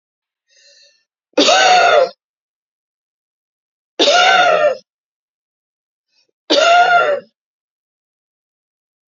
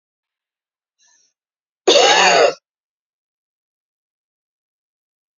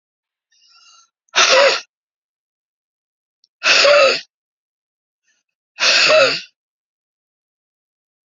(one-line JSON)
{"three_cough_length": "9.1 s", "three_cough_amplitude": 30751, "three_cough_signal_mean_std_ratio": 0.42, "cough_length": "5.4 s", "cough_amplitude": 32005, "cough_signal_mean_std_ratio": 0.29, "exhalation_length": "8.3 s", "exhalation_amplitude": 32767, "exhalation_signal_mean_std_ratio": 0.36, "survey_phase": "beta (2021-08-13 to 2022-03-07)", "age": "45-64", "gender": "Female", "wearing_mask": "No", "symptom_runny_or_blocked_nose": true, "symptom_fatigue": true, "symptom_change_to_sense_of_smell_or_taste": true, "symptom_other": true, "symptom_onset": "2 days", "smoker_status": "Never smoked", "respiratory_condition_asthma": true, "respiratory_condition_other": false, "recruitment_source": "Test and Trace", "submission_delay": "1 day", "covid_test_method": "ePCR"}